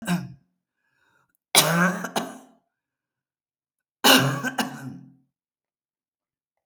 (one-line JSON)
{"three_cough_length": "6.7 s", "three_cough_amplitude": 32387, "three_cough_signal_mean_std_ratio": 0.34, "survey_phase": "beta (2021-08-13 to 2022-03-07)", "age": "65+", "gender": "Female", "wearing_mask": "No", "symptom_other": true, "symptom_onset": "12 days", "smoker_status": "Never smoked", "respiratory_condition_asthma": false, "respiratory_condition_other": false, "recruitment_source": "REACT", "submission_delay": "3 days", "covid_test_result": "Negative", "covid_test_method": "RT-qPCR"}